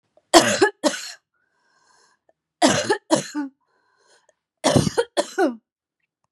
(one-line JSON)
{"three_cough_length": "6.3 s", "three_cough_amplitude": 32767, "three_cough_signal_mean_std_ratio": 0.37, "survey_phase": "beta (2021-08-13 to 2022-03-07)", "age": "18-44", "gender": "Female", "wearing_mask": "No", "symptom_headache": true, "symptom_onset": "12 days", "smoker_status": "Never smoked", "respiratory_condition_asthma": true, "respiratory_condition_other": false, "recruitment_source": "REACT", "submission_delay": "1 day", "covid_test_result": "Negative", "covid_test_method": "RT-qPCR", "influenza_a_test_result": "Negative", "influenza_b_test_result": "Negative"}